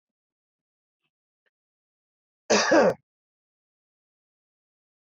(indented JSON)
{
  "cough_length": "5.0 s",
  "cough_amplitude": 11269,
  "cough_signal_mean_std_ratio": 0.23,
  "survey_phase": "beta (2021-08-13 to 2022-03-07)",
  "age": "45-64",
  "gender": "Male",
  "wearing_mask": "No",
  "symptom_none": true,
  "smoker_status": "Ex-smoker",
  "respiratory_condition_asthma": false,
  "respiratory_condition_other": false,
  "recruitment_source": "REACT",
  "submission_delay": "2 days",
  "covid_test_result": "Negative",
  "covid_test_method": "RT-qPCR",
  "influenza_a_test_result": "Unknown/Void",
  "influenza_b_test_result": "Unknown/Void"
}